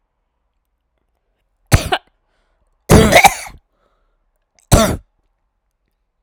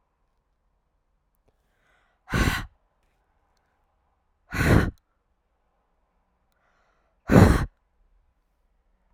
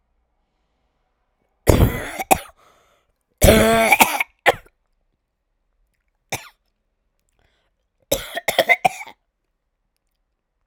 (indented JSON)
{
  "three_cough_length": "6.2 s",
  "three_cough_amplitude": 32768,
  "three_cough_signal_mean_std_ratio": 0.28,
  "exhalation_length": "9.1 s",
  "exhalation_amplitude": 28936,
  "exhalation_signal_mean_std_ratio": 0.24,
  "cough_length": "10.7 s",
  "cough_amplitude": 32768,
  "cough_signal_mean_std_ratio": 0.3,
  "survey_phase": "beta (2021-08-13 to 2022-03-07)",
  "age": "18-44",
  "gender": "Female",
  "wearing_mask": "No",
  "symptom_cough_any": true,
  "symptom_runny_or_blocked_nose": true,
  "symptom_sore_throat": true,
  "symptom_headache": true,
  "symptom_onset": "3 days",
  "smoker_status": "Never smoked",
  "respiratory_condition_asthma": true,
  "respiratory_condition_other": false,
  "recruitment_source": "Test and Trace",
  "submission_delay": "1 day",
  "covid_test_result": "Positive",
  "covid_test_method": "LAMP"
}